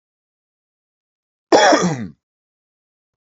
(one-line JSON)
{"cough_length": "3.3 s", "cough_amplitude": 28910, "cough_signal_mean_std_ratio": 0.29, "survey_phase": "beta (2021-08-13 to 2022-03-07)", "age": "45-64", "gender": "Male", "wearing_mask": "No", "symptom_none": true, "smoker_status": "Ex-smoker", "respiratory_condition_asthma": false, "respiratory_condition_other": false, "recruitment_source": "REACT", "submission_delay": "2 days", "covid_test_result": "Negative", "covid_test_method": "RT-qPCR"}